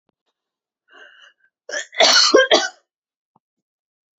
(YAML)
cough_length: 4.2 s
cough_amplitude: 32768
cough_signal_mean_std_ratio: 0.33
survey_phase: beta (2021-08-13 to 2022-03-07)
age: 18-44
gender: Female
wearing_mask: 'No'
symptom_none: true
smoker_status: Never smoked
respiratory_condition_asthma: false
respiratory_condition_other: false
recruitment_source: REACT
submission_delay: 0 days
covid_test_result: Negative
covid_test_method: RT-qPCR